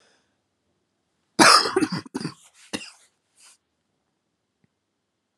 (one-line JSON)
{"cough_length": "5.4 s", "cough_amplitude": 32203, "cough_signal_mean_std_ratio": 0.24, "survey_phase": "alpha (2021-03-01 to 2021-08-12)", "age": "18-44", "gender": "Female", "wearing_mask": "No", "symptom_fatigue": true, "symptom_change_to_sense_of_smell_or_taste": true, "symptom_loss_of_taste": true, "symptom_onset": "5 days", "smoker_status": "Current smoker (1 to 10 cigarettes per day)", "respiratory_condition_asthma": false, "respiratory_condition_other": false, "recruitment_source": "Test and Trace", "submission_delay": "3 days", "covid_test_result": "Positive", "covid_test_method": "RT-qPCR", "covid_ct_value": 19.6, "covid_ct_gene": "ORF1ab gene", "covid_ct_mean": 19.7, "covid_viral_load": "340000 copies/ml", "covid_viral_load_category": "Low viral load (10K-1M copies/ml)"}